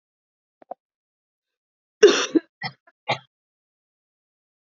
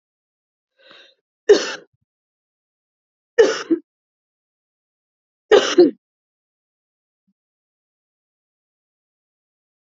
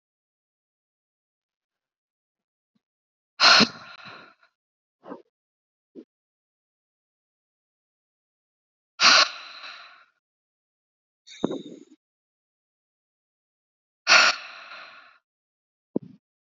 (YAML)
cough_length: 4.7 s
cough_amplitude: 30107
cough_signal_mean_std_ratio: 0.19
three_cough_length: 9.8 s
three_cough_amplitude: 30013
three_cough_signal_mean_std_ratio: 0.21
exhalation_length: 16.5 s
exhalation_amplitude: 32768
exhalation_signal_mean_std_ratio: 0.2
survey_phase: beta (2021-08-13 to 2022-03-07)
age: 18-44
gender: Female
wearing_mask: 'No'
symptom_cough_any: true
symptom_runny_or_blocked_nose: true
symptom_sore_throat: true
symptom_other: true
symptom_onset: 5 days
smoker_status: Never smoked
respiratory_condition_asthma: false
respiratory_condition_other: false
recruitment_source: Test and Trace
submission_delay: 1 day
covid_test_result: Positive
covid_test_method: RT-qPCR
covid_ct_value: 23.9
covid_ct_gene: ORF1ab gene